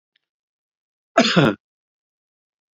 {"cough_length": "2.7 s", "cough_amplitude": 30392, "cough_signal_mean_std_ratio": 0.27, "survey_phase": "beta (2021-08-13 to 2022-03-07)", "age": "65+", "gender": "Male", "wearing_mask": "No", "symptom_none": true, "smoker_status": "Ex-smoker", "respiratory_condition_asthma": true, "respiratory_condition_other": false, "recruitment_source": "REACT", "submission_delay": "1 day", "covid_test_result": "Negative", "covid_test_method": "RT-qPCR", "influenza_a_test_result": "Negative", "influenza_b_test_result": "Negative"}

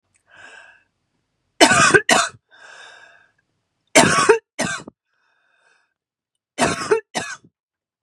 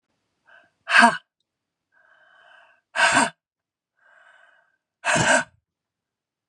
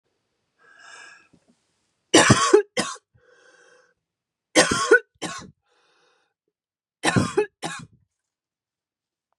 {"cough_length": "8.0 s", "cough_amplitude": 32768, "cough_signal_mean_std_ratio": 0.34, "exhalation_length": "6.5 s", "exhalation_amplitude": 29174, "exhalation_signal_mean_std_ratio": 0.3, "three_cough_length": "9.4 s", "three_cough_amplitude": 29927, "three_cough_signal_mean_std_ratio": 0.29, "survey_phase": "beta (2021-08-13 to 2022-03-07)", "age": "45-64", "gender": "Female", "wearing_mask": "No", "symptom_cough_any": true, "symptom_runny_or_blocked_nose": true, "symptom_sore_throat": true, "symptom_fatigue": true, "symptom_headache": true, "symptom_onset": "3 days", "smoker_status": "Never smoked", "respiratory_condition_asthma": true, "respiratory_condition_other": false, "recruitment_source": "Test and Trace", "submission_delay": "2 days", "covid_test_result": "Positive", "covid_test_method": "RT-qPCR", "covid_ct_value": 18.7, "covid_ct_gene": "N gene"}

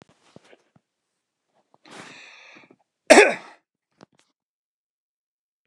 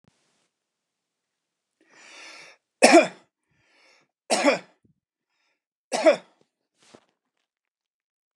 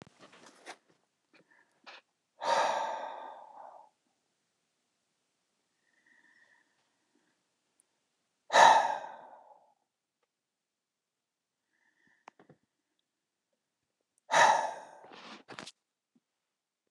{"cough_length": "5.7 s", "cough_amplitude": 29204, "cough_signal_mean_std_ratio": 0.16, "three_cough_length": "8.4 s", "three_cough_amplitude": 29204, "three_cough_signal_mean_std_ratio": 0.22, "exhalation_length": "16.9 s", "exhalation_amplitude": 13776, "exhalation_signal_mean_std_ratio": 0.23, "survey_phase": "beta (2021-08-13 to 2022-03-07)", "age": "45-64", "gender": "Male", "wearing_mask": "No", "symptom_none": true, "smoker_status": "Never smoked", "respiratory_condition_asthma": false, "respiratory_condition_other": false, "recruitment_source": "REACT", "submission_delay": "1 day", "covid_test_result": "Negative", "covid_test_method": "RT-qPCR", "influenza_a_test_result": "Negative", "influenza_b_test_result": "Negative"}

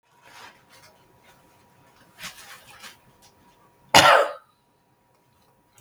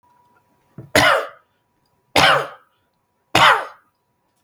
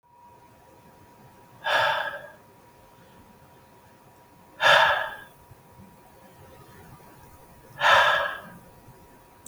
{"cough_length": "5.8 s", "cough_amplitude": 32768, "cough_signal_mean_std_ratio": 0.22, "three_cough_length": "4.4 s", "three_cough_amplitude": 32768, "three_cough_signal_mean_std_ratio": 0.36, "exhalation_length": "9.5 s", "exhalation_amplitude": 23017, "exhalation_signal_mean_std_ratio": 0.35, "survey_phase": "beta (2021-08-13 to 2022-03-07)", "age": "65+", "gender": "Male", "wearing_mask": "No", "symptom_none": true, "smoker_status": "Never smoked", "respiratory_condition_asthma": false, "respiratory_condition_other": false, "recruitment_source": "REACT", "submission_delay": "2 days", "covid_test_result": "Negative", "covid_test_method": "RT-qPCR", "influenza_a_test_result": "Negative", "influenza_b_test_result": "Negative"}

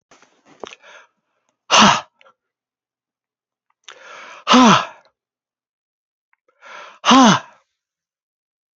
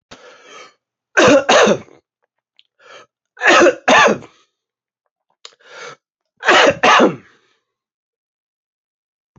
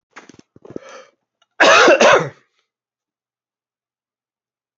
{"exhalation_length": "8.8 s", "exhalation_amplitude": 32768, "exhalation_signal_mean_std_ratio": 0.27, "three_cough_length": "9.4 s", "three_cough_amplitude": 32645, "three_cough_signal_mean_std_ratio": 0.37, "cough_length": "4.8 s", "cough_amplitude": 30487, "cough_signal_mean_std_ratio": 0.31, "survey_phase": "beta (2021-08-13 to 2022-03-07)", "age": "65+", "gender": "Male", "wearing_mask": "No", "symptom_cough_any": true, "symptom_sore_throat": true, "symptom_change_to_sense_of_smell_or_taste": true, "symptom_loss_of_taste": true, "smoker_status": "Never smoked", "respiratory_condition_asthma": false, "respiratory_condition_other": false, "recruitment_source": "Test and Trace", "submission_delay": "2 days", "covid_test_result": "Positive", "covid_test_method": "RT-qPCR", "covid_ct_value": 14.9, "covid_ct_gene": "ORF1ab gene", "covid_ct_mean": 15.3, "covid_viral_load": "9600000 copies/ml", "covid_viral_load_category": "High viral load (>1M copies/ml)"}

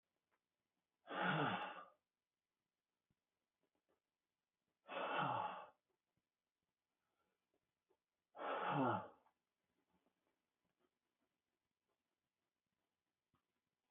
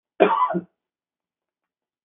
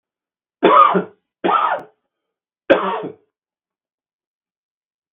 {"exhalation_length": "13.9 s", "exhalation_amplitude": 1320, "exhalation_signal_mean_std_ratio": 0.31, "cough_length": "2.0 s", "cough_amplitude": 32768, "cough_signal_mean_std_ratio": 0.33, "three_cough_length": "5.1 s", "three_cough_amplitude": 32768, "three_cough_signal_mean_std_ratio": 0.34, "survey_phase": "beta (2021-08-13 to 2022-03-07)", "age": "65+", "gender": "Male", "wearing_mask": "No", "symptom_none": true, "smoker_status": "Never smoked", "respiratory_condition_asthma": false, "respiratory_condition_other": false, "recruitment_source": "REACT", "submission_delay": "2 days", "covid_test_result": "Negative", "covid_test_method": "RT-qPCR", "influenza_a_test_result": "Negative", "influenza_b_test_result": "Negative"}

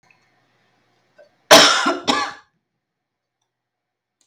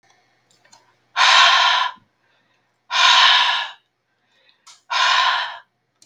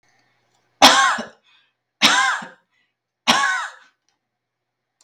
{"cough_length": "4.3 s", "cough_amplitude": 32768, "cough_signal_mean_std_ratio": 0.28, "exhalation_length": "6.1 s", "exhalation_amplitude": 32710, "exhalation_signal_mean_std_ratio": 0.49, "three_cough_length": "5.0 s", "three_cough_amplitude": 32768, "three_cough_signal_mean_std_ratio": 0.36, "survey_phase": "beta (2021-08-13 to 2022-03-07)", "age": "18-44", "gender": "Female", "wearing_mask": "No", "symptom_runny_or_blocked_nose": true, "symptom_sore_throat": true, "symptom_fatigue": true, "symptom_onset": "7 days", "smoker_status": "Ex-smoker", "respiratory_condition_asthma": false, "respiratory_condition_other": false, "recruitment_source": "REACT", "submission_delay": "2 days", "covid_test_result": "Negative", "covid_test_method": "RT-qPCR"}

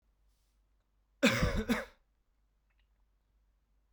{"cough_length": "3.9 s", "cough_amplitude": 6109, "cough_signal_mean_std_ratio": 0.29, "survey_phase": "beta (2021-08-13 to 2022-03-07)", "age": "18-44", "gender": "Male", "wearing_mask": "No", "symptom_cough_any": true, "symptom_runny_or_blocked_nose": true, "symptom_fatigue": true, "symptom_fever_high_temperature": true, "symptom_headache": true, "symptom_onset": "3 days", "smoker_status": "Never smoked", "respiratory_condition_asthma": false, "respiratory_condition_other": false, "recruitment_source": "Test and Trace", "submission_delay": "1 day", "covid_test_result": "Positive", "covid_test_method": "RT-qPCR", "covid_ct_value": 16.4, "covid_ct_gene": "ORF1ab gene", "covid_ct_mean": 17.1, "covid_viral_load": "2500000 copies/ml", "covid_viral_load_category": "High viral load (>1M copies/ml)"}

